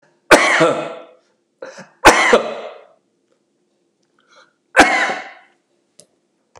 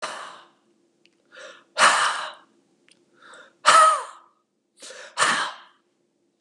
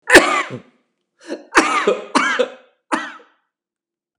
{"three_cough_length": "6.6 s", "three_cough_amplitude": 32768, "three_cough_signal_mean_std_ratio": 0.35, "exhalation_length": "6.4 s", "exhalation_amplitude": 30730, "exhalation_signal_mean_std_ratio": 0.35, "cough_length": "4.2 s", "cough_amplitude": 32768, "cough_signal_mean_std_ratio": 0.4, "survey_phase": "beta (2021-08-13 to 2022-03-07)", "age": "65+", "gender": "Male", "wearing_mask": "No", "symptom_none": true, "smoker_status": "Never smoked", "respiratory_condition_asthma": false, "respiratory_condition_other": false, "recruitment_source": "REACT", "submission_delay": "1 day", "covid_test_result": "Negative", "covid_test_method": "RT-qPCR", "influenza_a_test_result": "Negative", "influenza_b_test_result": "Negative"}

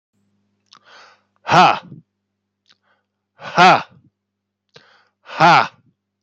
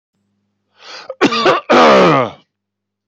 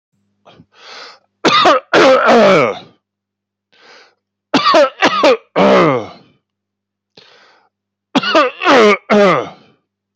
{"exhalation_length": "6.2 s", "exhalation_amplitude": 30032, "exhalation_signal_mean_std_ratio": 0.29, "cough_length": "3.1 s", "cough_amplitude": 30009, "cough_signal_mean_std_ratio": 0.49, "three_cough_length": "10.2 s", "three_cough_amplitude": 30496, "three_cough_signal_mean_std_ratio": 0.51, "survey_phase": "beta (2021-08-13 to 2022-03-07)", "age": "45-64", "gender": "Male", "wearing_mask": "No", "symptom_none": true, "smoker_status": "Ex-smoker", "respiratory_condition_asthma": false, "respiratory_condition_other": false, "recruitment_source": "REACT", "submission_delay": "1 day", "covid_test_result": "Negative", "covid_test_method": "RT-qPCR"}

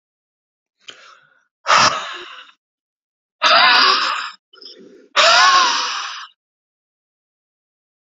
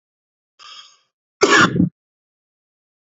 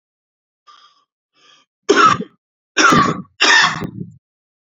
{"exhalation_length": "8.2 s", "exhalation_amplitude": 32521, "exhalation_signal_mean_std_ratio": 0.42, "cough_length": "3.1 s", "cough_amplitude": 32073, "cough_signal_mean_std_ratio": 0.3, "three_cough_length": "4.7 s", "three_cough_amplitude": 31066, "three_cough_signal_mean_std_ratio": 0.41, "survey_phase": "beta (2021-08-13 to 2022-03-07)", "age": "18-44", "gender": "Male", "wearing_mask": "No", "symptom_cough_any": true, "smoker_status": "Ex-smoker", "respiratory_condition_asthma": false, "respiratory_condition_other": false, "recruitment_source": "REACT", "submission_delay": "1 day", "covid_test_result": "Negative", "covid_test_method": "RT-qPCR", "influenza_a_test_result": "Unknown/Void", "influenza_b_test_result": "Unknown/Void"}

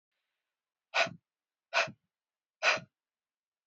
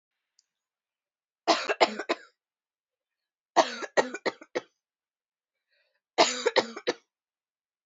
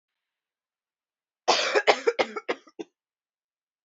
{"exhalation_length": "3.7 s", "exhalation_amplitude": 7312, "exhalation_signal_mean_std_ratio": 0.27, "three_cough_length": "7.9 s", "three_cough_amplitude": 18509, "three_cough_signal_mean_std_ratio": 0.28, "cough_length": "3.8 s", "cough_amplitude": 19266, "cough_signal_mean_std_ratio": 0.31, "survey_phase": "alpha (2021-03-01 to 2021-08-12)", "age": "18-44", "gender": "Female", "wearing_mask": "No", "symptom_none": true, "smoker_status": "Current smoker (1 to 10 cigarettes per day)", "respiratory_condition_asthma": true, "respiratory_condition_other": false, "recruitment_source": "REACT", "submission_delay": "1 day", "covid_test_result": "Negative", "covid_test_method": "RT-qPCR"}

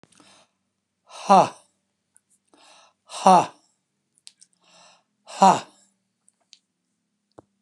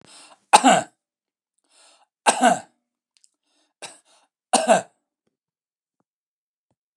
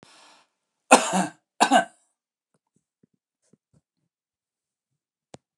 {"exhalation_length": "7.6 s", "exhalation_amplitude": 28182, "exhalation_signal_mean_std_ratio": 0.21, "three_cough_length": "7.0 s", "three_cough_amplitude": 29204, "three_cough_signal_mean_std_ratio": 0.25, "cough_length": "5.6 s", "cough_amplitude": 29203, "cough_signal_mean_std_ratio": 0.21, "survey_phase": "alpha (2021-03-01 to 2021-08-12)", "age": "65+", "gender": "Male", "wearing_mask": "No", "symptom_none": true, "smoker_status": "Ex-smoker", "respiratory_condition_asthma": false, "respiratory_condition_other": false, "recruitment_source": "REACT", "submission_delay": "2 days", "covid_test_result": "Negative", "covid_test_method": "RT-qPCR"}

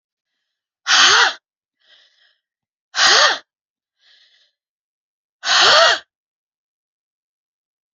{"exhalation_length": "7.9 s", "exhalation_amplitude": 31527, "exhalation_signal_mean_std_ratio": 0.34, "survey_phase": "beta (2021-08-13 to 2022-03-07)", "age": "45-64", "gender": "Female", "wearing_mask": "No", "symptom_cough_any": true, "symptom_runny_or_blocked_nose": true, "symptom_shortness_of_breath": true, "symptom_sore_throat": true, "symptom_fatigue": true, "symptom_headache": true, "symptom_change_to_sense_of_smell_or_taste": true, "smoker_status": "Never smoked", "respiratory_condition_asthma": false, "respiratory_condition_other": false, "recruitment_source": "Test and Trace", "submission_delay": "0 days", "covid_test_result": "Negative", "covid_test_method": "LFT"}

